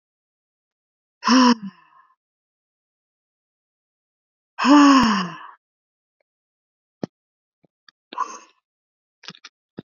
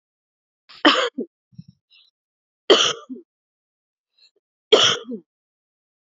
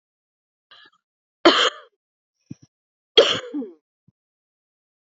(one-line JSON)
{"exhalation_length": "10.0 s", "exhalation_amplitude": 25374, "exhalation_signal_mean_std_ratio": 0.26, "three_cough_length": "6.1 s", "three_cough_amplitude": 28508, "three_cough_signal_mean_std_ratio": 0.28, "cough_length": "5.0 s", "cough_amplitude": 29505, "cough_signal_mean_std_ratio": 0.24, "survey_phase": "beta (2021-08-13 to 2022-03-07)", "age": "45-64", "gender": "Female", "wearing_mask": "No", "symptom_none": true, "symptom_onset": "13 days", "smoker_status": "Never smoked", "respiratory_condition_asthma": false, "respiratory_condition_other": false, "recruitment_source": "REACT", "submission_delay": "1 day", "covid_test_result": "Negative", "covid_test_method": "RT-qPCR", "influenza_a_test_result": "Negative", "influenza_b_test_result": "Negative"}